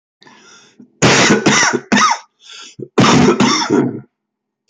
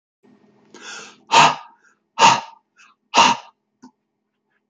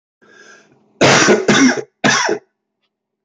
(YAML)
cough_length: 4.7 s
cough_amplitude: 30887
cough_signal_mean_std_ratio: 0.58
exhalation_length: 4.7 s
exhalation_amplitude: 29653
exhalation_signal_mean_std_ratio: 0.31
three_cough_length: 3.2 s
three_cough_amplitude: 29574
three_cough_signal_mean_std_ratio: 0.5
survey_phase: beta (2021-08-13 to 2022-03-07)
age: 45-64
gender: Male
wearing_mask: 'No'
symptom_none: true
symptom_onset: 4 days
smoker_status: Ex-smoker
respiratory_condition_asthma: true
respiratory_condition_other: false
recruitment_source: REACT
submission_delay: 2 days
covid_test_result: Negative
covid_test_method: RT-qPCR